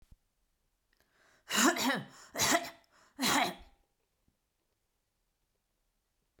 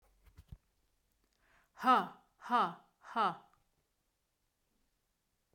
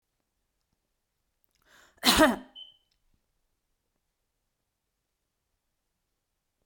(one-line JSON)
{"three_cough_length": "6.4 s", "three_cough_amplitude": 7187, "three_cough_signal_mean_std_ratio": 0.34, "exhalation_length": "5.5 s", "exhalation_amplitude": 4810, "exhalation_signal_mean_std_ratio": 0.27, "cough_length": "6.7 s", "cough_amplitude": 21997, "cough_signal_mean_std_ratio": 0.18, "survey_phase": "beta (2021-08-13 to 2022-03-07)", "age": "18-44", "gender": "Female", "wearing_mask": "No", "symptom_none": true, "smoker_status": "Never smoked", "respiratory_condition_asthma": false, "respiratory_condition_other": false, "recruitment_source": "REACT", "submission_delay": "2 days", "covid_test_result": "Negative", "covid_test_method": "RT-qPCR"}